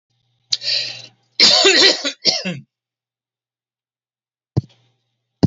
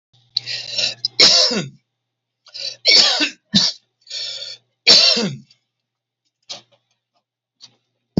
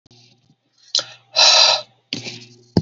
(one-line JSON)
{"cough_length": "5.5 s", "cough_amplitude": 32375, "cough_signal_mean_std_ratio": 0.37, "three_cough_length": "8.2 s", "three_cough_amplitude": 32768, "three_cough_signal_mean_std_ratio": 0.4, "exhalation_length": "2.8 s", "exhalation_amplitude": 32736, "exhalation_signal_mean_std_ratio": 0.39, "survey_phase": "alpha (2021-03-01 to 2021-08-12)", "age": "65+", "gender": "Male", "wearing_mask": "No", "symptom_none": true, "smoker_status": "Never smoked", "respiratory_condition_asthma": false, "respiratory_condition_other": false, "recruitment_source": "REACT", "submission_delay": "1 day", "covid_test_result": "Negative", "covid_test_method": "RT-qPCR"}